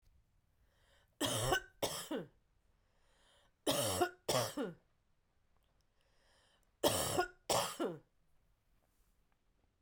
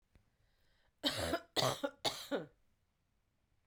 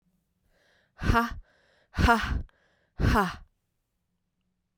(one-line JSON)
{"three_cough_length": "9.8 s", "three_cough_amplitude": 4726, "three_cough_signal_mean_std_ratio": 0.4, "cough_length": "3.7 s", "cough_amplitude": 4212, "cough_signal_mean_std_ratio": 0.39, "exhalation_length": "4.8 s", "exhalation_amplitude": 12888, "exhalation_signal_mean_std_ratio": 0.37, "survey_phase": "beta (2021-08-13 to 2022-03-07)", "age": "45-64", "gender": "Female", "wearing_mask": "No", "symptom_runny_or_blocked_nose": true, "symptom_fatigue": true, "symptom_headache": true, "symptom_onset": "3 days", "smoker_status": "Never smoked", "respiratory_condition_asthma": false, "respiratory_condition_other": false, "recruitment_source": "Test and Trace", "submission_delay": "2 days", "covid_test_result": "Positive", "covid_test_method": "RT-qPCR", "covid_ct_value": 20.8, "covid_ct_gene": "N gene"}